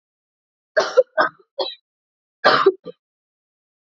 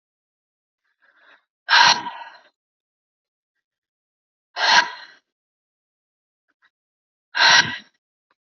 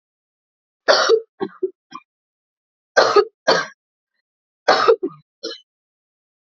{
  "cough_length": "3.8 s",
  "cough_amplitude": 28058,
  "cough_signal_mean_std_ratio": 0.32,
  "exhalation_length": "8.4 s",
  "exhalation_amplitude": 29075,
  "exhalation_signal_mean_std_ratio": 0.27,
  "three_cough_length": "6.5 s",
  "three_cough_amplitude": 32333,
  "three_cough_signal_mean_std_ratio": 0.34,
  "survey_phase": "alpha (2021-03-01 to 2021-08-12)",
  "age": "18-44",
  "gender": "Female",
  "wearing_mask": "No",
  "symptom_cough_any": true,
  "symptom_new_continuous_cough": true,
  "symptom_shortness_of_breath": true,
  "symptom_headache": true,
  "symptom_change_to_sense_of_smell_or_taste": true,
  "symptom_loss_of_taste": true,
  "symptom_onset": "3 days",
  "smoker_status": "Never smoked",
  "respiratory_condition_asthma": false,
  "respiratory_condition_other": false,
  "recruitment_source": "Test and Trace",
  "submission_delay": "2 days",
  "covid_test_result": "Positive",
  "covid_test_method": "RT-qPCR",
  "covid_ct_value": 15.7,
  "covid_ct_gene": "ORF1ab gene",
  "covid_ct_mean": 16.8,
  "covid_viral_load": "3100000 copies/ml",
  "covid_viral_load_category": "High viral load (>1M copies/ml)"
}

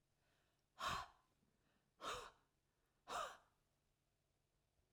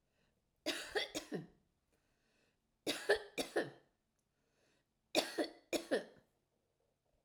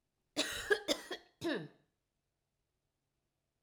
{
  "exhalation_length": "4.9 s",
  "exhalation_amplitude": 792,
  "exhalation_signal_mean_std_ratio": 0.34,
  "three_cough_length": "7.2 s",
  "three_cough_amplitude": 4323,
  "three_cough_signal_mean_std_ratio": 0.34,
  "cough_length": "3.6 s",
  "cough_amplitude": 5241,
  "cough_signal_mean_std_ratio": 0.34,
  "survey_phase": "alpha (2021-03-01 to 2021-08-12)",
  "age": "65+",
  "gender": "Female",
  "wearing_mask": "No",
  "symptom_none": true,
  "smoker_status": "Never smoked",
  "respiratory_condition_asthma": false,
  "respiratory_condition_other": false,
  "recruitment_source": "REACT",
  "submission_delay": "1 day",
  "covid_test_result": "Negative",
  "covid_test_method": "RT-qPCR"
}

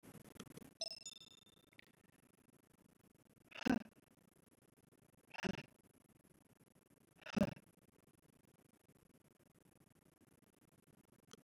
{
  "exhalation_length": "11.4 s",
  "exhalation_amplitude": 2137,
  "exhalation_signal_mean_std_ratio": 0.21,
  "survey_phase": "beta (2021-08-13 to 2022-03-07)",
  "age": "45-64",
  "gender": "Female",
  "wearing_mask": "No",
  "symptom_none": true,
  "smoker_status": "Never smoked",
  "respiratory_condition_asthma": false,
  "respiratory_condition_other": false,
  "recruitment_source": "REACT",
  "submission_delay": "2 days",
  "covid_test_result": "Negative",
  "covid_test_method": "RT-qPCR",
  "influenza_a_test_result": "Negative",
  "influenza_b_test_result": "Negative"
}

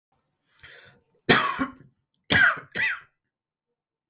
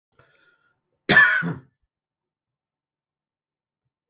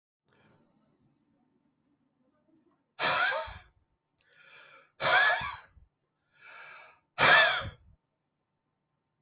{
  "three_cough_length": "4.1 s",
  "three_cough_amplitude": 17703,
  "three_cough_signal_mean_std_ratio": 0.35,
  "cough_length": "4.1 s",
  "cough_amplitude": 21404,
  "cough_signal_mean_std_ratio": 0.24,
  "exhalation_length": "9.2 s",
  "exhalation_amplitude": 10600,
  "exhalation_signal_mean_std_ratio": 0.31,
  "survey_phase": "beta (2021-08-13 to 2022-03-07)",
  "age": "45-64",
  "gender": "Male",
  "wearing_mask": "No",
  "symptom_new_continuous_cough": true,
  "symptom_runny_or_blocked_nose": true,
  "symptom_shortness_of_breath": true,
  "symptom_sore_throat": true,
  "symptom_fatigue": true,
  "symptom_headache": true,
  "symptom_change_to_sense_of_smell_or_taste": true,
  "smoker_status": "Never smoked",
  "respiratory_condition_asthma": false,
  "respiratory_condition_other": false,
  "recruitment_source": "Test and Trace",
  "submission_delay": "3 days",
  "covid_test_result": "Positive",
  "covid_test_method": "LFT"
}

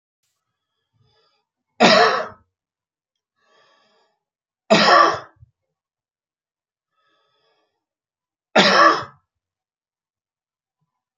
{
  "three_cough_length": "11.2 s",
  "three_cough_amplitude": 30107,
  "three_cough_signal_mean_std_ratio": 0.28,
  "survey_phase": "beta (2021-08-13 to 2022-03-07)",
  "age": "45-64",
  "gender": "Male",
  "wearing_mask": "No",
  "symptom_runny_or_blocked_nose": true,
  "symptom_onset": "12 days",
  "smoker_status": "Never smoked",
  "respiratory_condition_asthma": false,
  "respiratory_condition_other": false,
  "recruitment_source": "REACT",
  "submission_delay": "0 days",
  "covid_test_result": "Negative",
  "covid_test_method": "RT-qPCR",
  "influenza_a_test_result": "Negative",
  "influenza_b_test_result": "Negative"
}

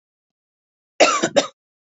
{
  "cough_length": "2.0 s",
  "cough_amplitude": 28291,
  "cough_signal_mean_std_ratio": 0.31,
  "survey_phase": "beta (2021-08-13 to 2022-03-07)",
  "age": "18-44",
  "gender": "Female",
  "wearing_mask": "No",
  "symptom_none": true,
  "smoker_status": "Never smoked",
  "respiratory_condition_asthma": false,
  "respiratory_condition_other": false,
  "recruitment_source": "REACT",
  "submission_delay": "3 days",
  "covid_test_result": "Negative",
  "covid_test_method": "RT-qPCR",
  "influenza_a_test_result": "Negative",
  "influenza_b_test_result": "Negative"
}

